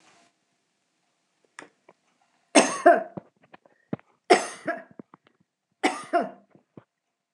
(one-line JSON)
{"three_cough_length": "7.3 s", "three_cough_amplitude": 24887, "three_cough_signal_mean_std_ratio": 0.25, "survey_phase": "beta (2021-08-13 to 2022-03-07)", "age": "45-64", "gender": "Female", "wearing_mask": "Yes", "symptom_none": true, "smoker_status": "Never smoked", "respiratory_condition_asthma": false, "respiratory_condition_other": false, "recruitment_source": "REACT", "submission_delay": "3 days", "covid_test_result": "Negative", "covid_test_method": "RT-qPCR"}